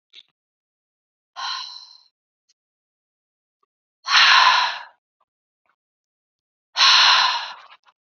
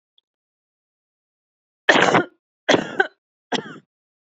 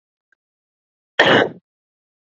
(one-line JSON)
{"exhalation_length": "8.2 s", "exhalation_amplitude": 27228, "exhalation_signal_mean_std_ratio": 0.34, "three_cough_length": "4.4 s", "three_cough_amplitude": 28876, "three_cough_signal_mean_std_ratio": 0.29, "cough_length": "2.2 s", "cough_amplitude": 32768, "cough_signal_mean_std_ratio": 0.29, "survey_phase": "beta (2021-08-13 to 2022-03-07)", "age": "18-44", "gender": "Female", "wearing_mask": "No", "symptom_none": true, "smoker_status": "Never smoked", "respiratory_condition_asthma": false, "respiratory_condition_other": false, "recruitment_source": "REACT", "submission_delay": "1 day", "covid_test_result": "Negative", "covid_test_method": "RT-qPCR", "influenza_a_test_result": "Negative", "influenza_b_test_result": "Negative"}